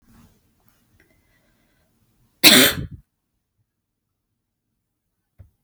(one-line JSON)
{"cough_length": "5.6 s", "cough_amplitude": 32768, "cough_signal_mean_std_ratio": 0.19, "survey_phase": "beta (2021-08-13 to 2022-03-07)", "age": "18-44", "gender": "Female", "wearing_mask": "No", "symptom_none": true, "symptom_onset": "8 days", "smoker_status": "Never smoked", "respiratory_condition_asthma": false, "respiratory_condition_other": false, "recruitment_source": "REACT", "submission_delay": "6 days", "covid_test_result": "Negative", "covid_test_method": "RT-qPCR"}